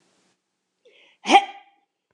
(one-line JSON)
{"cough_length": "2.1 s", "cough_amplitude": 27609, "cough_signal_mean_std_ratio": 0.21, "survey_phase": "beta (2021-08-13 to 2022-03-07)", "age": "45-64", "gender": "Female", "wearing_mask": "No", "symptom_none": true, "smoker_status": "Ex-smoker", "respiratory_condition_asthma": false, "respiratory_condition_other": false, "recruitment_source": "REACT", "submission_delay": "2 days", "covid_test_result": "Negative", "covid_test_method": "RT-qPCR", "influenza_a_test_result": "Negative", "influenza_b_test_result": "Negative"}